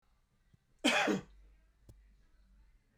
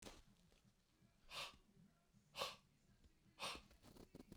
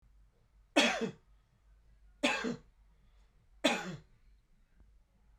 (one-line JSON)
{"cough_length": "3.0 s", "cough_amplitude": 4786, "cough_signal_mean_std_ratio": 0.32, "exhalation_length": "4.4 s", "exhalation_amplitude": 1014, "exhalation_signal_mean_std_ratio": 0.45, "three_cough_length": "5.4 s", "three_cough_amplitude": 7330, "three_cough_signal_mean_std_ratio": 0.33, "survey_phase": "beta (2021-08-13 to 2022-03-07)", "age": "45-64", "gender": "Male", "wearing_mask": "No", "symptom_none": true, "smoker_status": "Ex-smoker", "respiratory_condition_asthma": false, "respiratory_condition_other": false, "recruitment_source": "REACT", "submission_delay": "8 days", "covid_test_result": "Negative", "covid_test_method": "RT-qPCR"}